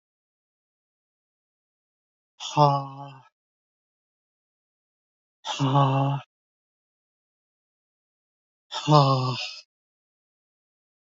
{"exhalation_length": "11.1 s", "exhalation_amplitude": 24902, "exhalation_signal_mean_std_ratio": 0.31, "survey_phase": "beta (2021-08-13 to 2022-03-07)", "age": "45-64", "gender": "Male", "wearing_mask": "No", "symptom_runny_or_blocked_nose": true, "symptom_fatigue": true, "symptom_change_to_sense_of_smell_or_taste": true, "symptom_loss_of_taste": true, "smoker_status": "Never smoked", "respiratory_condition_asthma": false, "respiratory_condition_other": false, "recruitment_source": "Test and Trace", "submission_delay": "2 days", "covid_test_result": "Positive", "covid_test_method": "RT-qPCR", "covid_ct_value": 19.5, "covid_ct_gene": "ORF1ab gene", "covid_ct_mean": 19.6, "covid_viral_load": "380000 copies/ml", "covid_viral_load_category": "Low viral load (10K-1M copies/ml)"}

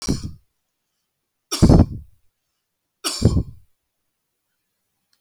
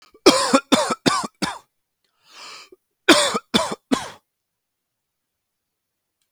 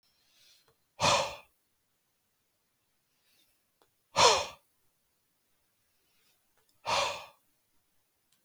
{"three_cough_length": "5.2 s", "three_cough_amplitude": 32244, "three_cough_signal_mean_std_ratio": 0.28, "cough_length": "6.3 s", "cough_amplitude": 32768, "cough_signal_mean_std_ratio": 0.34, "exhalation_length": "8.4 s", "exhalation_amplitude": 12673, "exhalation_signal_mean_std_ratio": 0.25, "survey_phase": "beta (2021-08-13 to 2022-03-07)", "age": "18-44", "gender": "Male", "wearing_mask": "No", "symptom_none": true, "symptom_onset": "12 days", "smoker_status": "Never smoked", "respiratory_condition_asthma": true, "respiratory_condition_other": false, "recruitment_source": "REACT", "submission_delay": "1 day", "covid_test_result": "Negative", "covid_test_method": "RT-qPCR", "influenza_a_test_result": "Negative", "influenza_b_test_result": "Negative"}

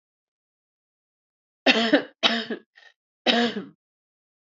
{"three_cough_length": "4.5 s", "three_cough_amplitude": 26355, "three_cough_signal_mean_std_ratio": 0.34, "survey_phase": "beta (2021-08-13 to 2022-03-07)", "age": "18-44", "gender": "Female", "wearing_mask": "No", "symptom_cough_any": true, "symptom_runny_or_blocked_nose": true, "symptom_shortness_of_breath": true, "symptom_fatigue": true, "symptom_headache": true, "symptom_change_to_sense_of_smell_or_taste": true, "symptom_loss_of_taste": true, "symptom_onset": "6 days", "smoker_status": "Ex-smoker", "respiratory_condition_asthma": false, "respiratory_condition_other": false, "recruitment_source": "Test and Trace", "submission_delay": "2 days", "covid_test_result": "Positive", "covid_test_method": "RT-qPCR"}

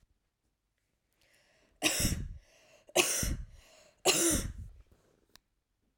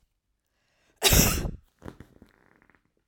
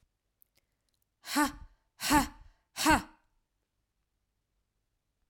{"three_cough_length": "6.0 s", "three_cough_amplitude": 10959, "three_cough_signal_mean_std_ratio": 0.39, "cough_length": "3.1 s", "cough_amplitude": 18296, "cough_signal_mean_std_ratio": 0.31, "exhalation_length": "5.3 s", "exhalation_amplitude": 8663, "exhalation_signal_mean_std_ratio": 0.28, "survey_phase": "alpha (2021-03-01 to 2021-08-12)", "age": "18-44", "gender": "Female", "wearing_mask": "No", "symptom_none": true, "smoker_status": "Never smoked", "respiratory_condition_asthma": true, "respiratory_condition_other": true, "recruitment_source": "REACT", "submission_delay": "1 day", "covid_test_result": "Negative", "covid_test_method": "RT-qPCR"}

